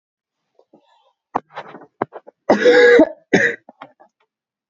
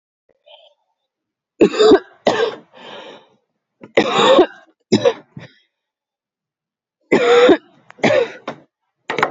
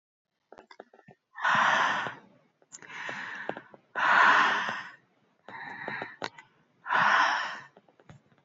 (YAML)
cough_length: 4.7 s
cough_amplitude: 27893
cough_signal_mean_std_ratio: 0.35
three_cough_length: 9.3 s
three_cough_amplitude: 32768
three_cough_signal_mean_std_ratio: 0.39
exhalation_length: 8.4 s
exhalation_amplitude: 11610
exhalation_signal_mean_std_ratio: 0.47
survey_phase: beta (2021-08-13 to 2022-03-07)
age: 18-44
gender: Female
wearing_mask: 'No'
symptom_cough_any: true
symptom_runny_or_blocked_nose: true
symptom_shortness_of_breath: true
symptom_sore_throat: true
symptom_fever_high_temperature: true
symptom_headache: true
symptom_onset: 3 days
smoker_status: Never smoked
respiratory_condition_asthma: false
respiratory_condition_other: false
recruitment_source: Test and Trace
submission_delay: 2 days
covid_test_result: Positive
covid_test_method: RT-qPCR
covid_ct_value: 15.9
covid_ct_gene: ORF1ab gene
covid_ct_mean: 16.5
covid_viral_load: 4000000 copies/ml
covid_viral_load_category: High viral load (>1M copies/ml)